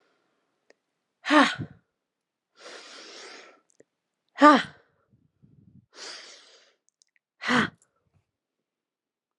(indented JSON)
{
  "exhalation_length": "9.4 s",
  "exhalation_amplitude": 30778,
  "exhalation_signal_mean_std_ratio": 0.21,
  "survey_phase": "alpha (2021-03-01 to 2021-08-12)",
  "age": "45-64",
  "gender": "Female",
  "wearing_mask": "No",
  "symptom_none": true,
  "smoker_status": "Never smoked",
  "respiratory_condition_asthma": false,
  "respiratory_condition_other": false,
  "recruitment_source": "REACT",
  "submission_delay": "18 days",
  "covid_test_result": "Negative",
  "covid_test_method": "RT-qPCR"
}